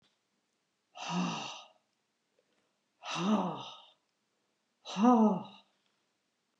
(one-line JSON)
{"exhalation_length": "6.6 s", "exhalation_amplitude": 7917, "exhalation_signal_mean_std_ratio": 0.36, "survey_phase": "beta (2021-08-13 to 2022-03-07)", "age": "65+", "gender": "Female", "wearing_mask": "No", "symptom_none": true, "smoker_status": "Never smoked", "respiratory_condition_asthma": false, "respiratory_condition_other": false, "recruitment_source": "REACT", "submission_delay": "2 days", "covid_test_result": "Negative", "covid_test_method": "RT-qPCR", "influenza_a_test_result": "Negative", "influenza_b_test_result": "Negative"}